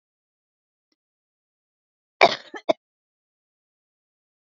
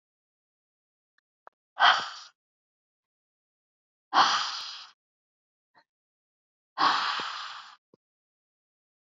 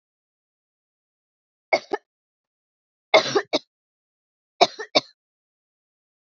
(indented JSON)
{
  "cough_length": "4.4 s",
  "cough_amplitude": 28108,
  "cough_signal_mean_std_ratio": 0.13,
  "exhalation_length": "9.0 s",
  "exhalation_amplitude": 16093,
  "exhalation_signal_mean_std_ratio": 0.28,
  "three_cough_length": "6.4 s",
  "three_cough_amplitude": 29526,
  "three_cough_signal_mean_std_ratio": 0.2,
  "survey_phase": "beta (2021-08-13 to 2022-03-07)",
  "age": "45-64",
  "gender": "Female",
  "wearing_mask": "No",
  "symptom_cough_any": true,
  "symptom_new_continuous_cough": true,
  "symptom_shortness_of_breath": true,
  "symptom_sore_throat": true,
  "symptom_headache": true,
  "symptom_onset": "7 days",
  "smoker_status": "Never smoked",
  "respiratory_condition_asthma": false,
  "respiratory_condition_other": false,
  "recruitment_source": "REACT",
  "submission_delay": "1 day",
  "covid_test_result": "Negative",
  "covid_test_method": "RT-qPCR",
  "influenza_a_test_result": "Negative",
  "influenza_b_test_result": "Negative"
}